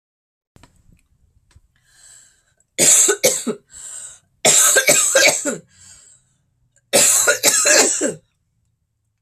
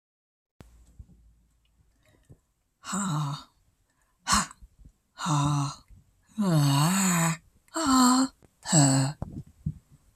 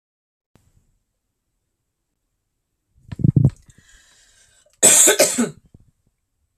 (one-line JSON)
{"three_cough_length": "9.2 s", "three_cough_amplitude": 32768, "three_cough_signal_mean_std_ratio": 0.46, "exhalation_length": "10.2 s", "exhalation_amplitude": 13475, "exhalation_signal_mean_std_ratio": 0.49, "cough_length": "6.6 s", "cough_amplitude": 32768, "cough_signal_mean_std_ratio": 0.28, "survey_phase": "beta (2021-08-13 to 2022-03-07)", "age": "45-64", "gender": "Female", "wearing_mask": "No", "symptom_none": true, "smoker_status": "Never smoked", "respiratory_condition_asthma": false, "respiratory_condition_other": false, "recruitment_source": "REACT", "submission_delay": "2 days", "covid_test_result": "Negative", "covid_test_method": "RT-qPCR"}